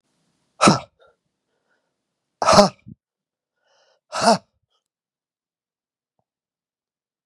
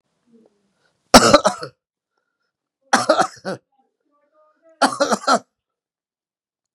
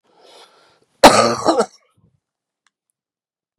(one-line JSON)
{"exhalation_length": "7.3 s", "exhalation_amplitude": 32768, "exhalation_signal_mean_std_ratio": 0.22, "three_cough_length": "6.7 s", "three_cough_amplitude": 32768, "three_cough_signal_mean_std_ratio": 0.28, "cough_length": "3.6 s", "cough_amplitude": 32768, "cough_signal_mean_std_ratio": 0.27, "survey_phase": "beta (2021-08-13 to 2022-03-07)", "age": "65+", "gender": "Male", "wearing_mask": "No", "symptom_new_continuous_cough": true, "symptom_runny_or_blocked_nose": true, "symptom_shortness_of_breath": true, "symptom_sore_throat": true, "symptom_fatigue": true, "smoker_status": "Never smoked", "respiratory_condition_asthma": false, "respiratory_condition_other": false, "recruitment_source": "Test and Trace", "submission_delay": "1 day", "covid_test_result": "Positive", "covid_test_method": "ePCR"}